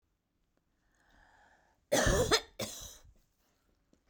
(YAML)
cough_length: 4.1 s
cough_amplitude: 7786
cough_signal_mean_std_ratio: 0.32
survey_phase: beta (2021-08-13 to 2022-03-07)
age: 45-64
gender: Female
wearing_mask: 'No'
symptom_none: true
smoker_status: Ex-smoker
respiratory_condition_asthma: false
respiratory_condition_other: false
recruitment_source: REACT
submission_delay: 6 days
covid_test_result: Negative
covid_test_method: RT-qPCR